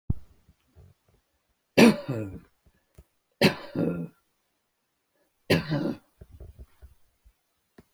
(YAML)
three_cough_length: 7.9 s
three_cough_amplitude: 22678
three_cough_signal_mean_std_ratio: 0.28
survey_phase: beta (2021-08-13 to 2022-03-07)
age: 65+
gender: Male
wearing_mask: 'No'
symptom_none: true
smoker_status: Never smoked
respiratory_condition_asthma: false
respiratory_condition_other: false
recruitment_source: REACT
submission_delay: 1 day
covid_test_result: Negative
covid_test_method: RT-qPCR
influenza_a_test_result: Negative
influenza_b_test_result: Negative